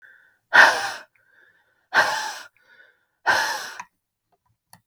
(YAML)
exhalation_length: 4.9 s
exhalation_amplitude: 32768
exhalation_signal_mean_std_ratio: 0.33
survey_phase: beta (2021-08-13 to 2022-03-07)
age: 45-64
gender: Female
wearing_mask: 'No'
symptom_none: true
smoker_status: Never smoked
respiratory_condition_asthma: false
respiratory_condition_other: false
recruitment_source: REACT
submission_delay: 1 day
covid_test_result: Negative
covid_test_method: RT-qPCR